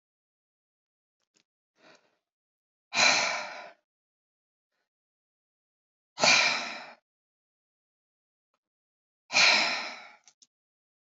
{"exhalation_length": "11.2 s", "exhalation_amplitude": 13739, "exhalation_signal_mean_std_ratio": 0.29, "survey_phase": "alpha (2021-03-01 to 2021-08-12)", "age": "45-64", "gender": "Female", "wearing_mask": "No", "symptom_none": true, "smoker_status": "Never smoked", "respiratory_condition_asthma": false, "respiratory_condition_other": false, "recruitment_source": "REACT", "submission_delay": "1 day", "covid_test_result": "Negative", "covid_test_method": "RT-qPCR"}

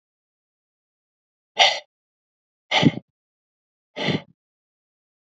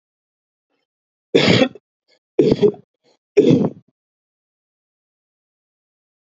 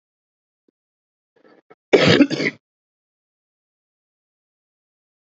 {"exhalation_length": "5.3 s", "exhalation_amplitude": 29246, "exhalation_signal_mean_std_ratio": 0.24, "three_cough_length": "6.2 s", "three_cough_amplitude": 27454, "three_cough_signal_mean_std_ratio": 0.3, "cough_length": "5.2 s", "cough_amplitude": 32707, "cough_signal_mean_std_ratio": 0.23, "survey_phase": "alpha (2021-03-01 to 2021-08-12)", "age": "45-64", "gender": "Male", "wearing_mask": "No", "symptom_cough_any": true, "symptom_fatigue": true, "symptom_onset": "12 days", "smoker_status": "Ex-smoker", "respiratory_condition_asthma": false, "respiratory_condition_other": false, "recruitment_source": "REACT", "submission_delay": "1 day", "covid_test_result": "Negative", "covid_test_method": "RT-qPCR"}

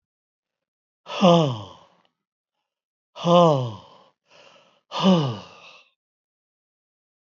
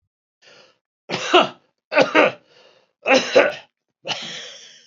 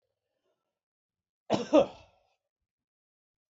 {"exhalation_length": "7.3 s", "exhalation_amplitude": 25421, "exhalation_signal_mean_std_ratio": 0.32, "three_cough_length": "4.9 s", "three_cough_amplitude": 28992, "three_cough_signal_mean_std_ratio": 0.38, "cough_length": "3.5 s", "cough_amplitude": 10815, "cough_signal_mean_std_ratio": 0.2, "survey_phase": "beta (2021-08-13 to 2022-03-07)", "age": "65+", "gender": "Male", "wearing_mask": "No", "symptom_none": true, "smoker_status": "Ex-smoker", "respiratory_condition_asthma": false, "respiratory_condition_other": false, "recruitment_source": "REACT", "submission_delay": "2 days", "covid_test_result": "Negative", "covid_test_method": "RT-qPCR", "influenza_a_test_result": "Negative", "influenza_b_test_result": "Negative"}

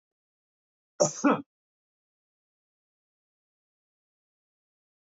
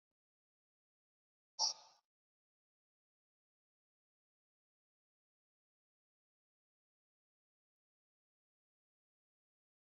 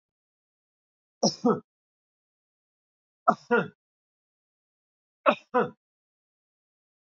{"cough_length": "5.0 s", "cough_amplitude": 11875, "cough_signal_mean_std_ratio": 0.17, "exhalation_length": "9.8 s", "exhalation_amplitude": 2175, "exhalation_signal_mean_std_ratio": 0.09, "three_cough_length": "7.1 s", "three_cough_amplitude": 16888, "three_cough_signal_mean_std_ratio": 0.23, "survey_phase": "beta (2021-08-13 to 2022-03-07)", "age": "65+", "gender": "Male", "wearing_mask": "No", "symptom_none": true, "smoker_status": "Never smoked", "respiratory_condition_asthma": false, "respiratory_condition_other": false, "recruitment_source": "REACT", "submission_delay": "1 day", "covid_test_result": "Negative", "covid_test_method": "RT-qPCR", "influenza_a_test_result": "Negative", "influenza_b_test_result": "Negative"}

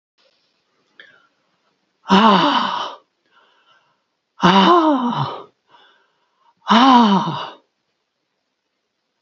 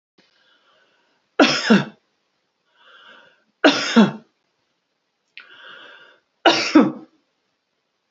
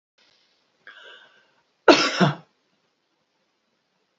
{"exhalation_length": "9.2 s", "exhalation_amplitude": 28682, "exhalation_signal_mean_std_ratio": 0.41, "three_cough_length": "8.1 s", "three_cough_amplitude": 32767, "three_cough_signal_mean_std_ratio": 0.3, "cough_length": "4.2 s", "cough_amplitude": 27306, "cough_signal_mean_std_ratio": 0.23, "survey_phase": "beta (2021-08-13 to 2022-03-07)", "age": "65+", "gender": "Female", "wearing_mask": "No", "symptom_none": true, "symptom_onset": "3 days", "smoker_status": "Never smoked", "respiratory_condition_asthma": false, "respiratory_condition_other": false, "recruitment_source": "REACT", "submission_delay": "3 days", "covid_test_result": "Negative", "covid_test_method": "RT-qPCR"}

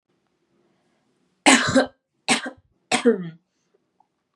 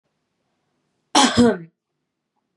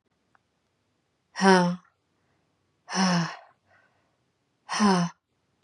{"three_cough_length": "4.4 s", "three_cough_amplitude": 32023, "three_cough_signal_mean_std_ratio": 0.32, "cough_length": "2.6 s", "cough_amplitude": 27265, "cough_signal_mean_std_ratio": 0.31, "exhalation_length": "5.6 s", "exhalation_amplitude": 25296, "exhalation_signal_mean_std_ratio": 0.34, "survey_phase": "beta (2021-08-13 to 2022-03-07)", "age": "18-44", "gender": "Female", "wearing_mask": "No", "symptom_none": true, "smoker_status": "Never smoked", "respiratory_condition_asthma": false, "respiratory_condition_other": false, "recruitment_source": "Test and Trace", "submission_delay": "0 days", "covid_test_result": "Negative", "covid_test_method": "LFT"}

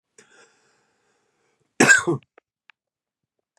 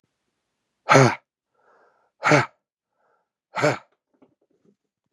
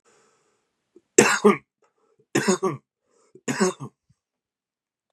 {"cough_length": "3.6 s", "cough_amplitude": 27429, "cough_signal_mean_std_ratio": 0.23, "exhalation_length": "5.1 s", "exhalation_amplitude": 31267, "exhalation_signal_mean_std_ratio": 0.26, "three_cough_length": "5.1 s", "three_cough_amplitude": 32768, "three_cough_signal_mean_std_ratio": 0.3, "survey_phase": "beta (2021-08-13 to 2022-03-07)", "age": "18-44", "gender": "Male", "wearing_mask": "No", "symptom_fatigue": true, "symptom_headache": true, "symptom_onset": "6 days", "smoker_status": "Current smoker (11 or more cigarettes per day)", "respiratory_condition_asthma": false, "respiratory_condition_other": false, "recruitment_source": "REACT", "submission_delay": "1 day", "covid_test_result": "Negative", "covid_test_method": "RT-qPCR", "influenza_a_test_result": "Negative", "influenza_b_test_result": "Negative"}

